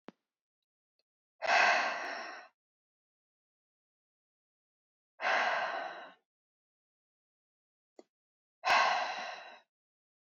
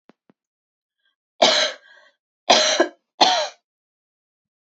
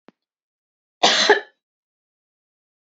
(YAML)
exhalation_length: 10.2 s
exhalation_amplitude: 6649
exhalation_signal_mean_std_ratio: 0.35
three_cough_length: 4.6 s
three_cough_amplitude: 29658
three_cough_signal_mean_std_ratio: 0.35
cough_length: 2.8 s
cough_amplitude: 29065
cough_signal_mean_std_ratio: 0.27
survey_phase: beta (2021-08-13 to 2022-03-07)
age: 18-44
gender: Female
wearing_mask: 'No'
symptom_fatigue: true
symptom_headache: true
symptom_onset: 12 days
smoker_status: Never smoked
respiratory_condition_asthma: false
respiratory_condition_other: false
recruitment_source: REACT
submission_delay: 0 days
covid_test_result: Negative
covid_test_method: RT-qPCR
influenza_a_test_result: Negative
influenza_b_test_result: Negative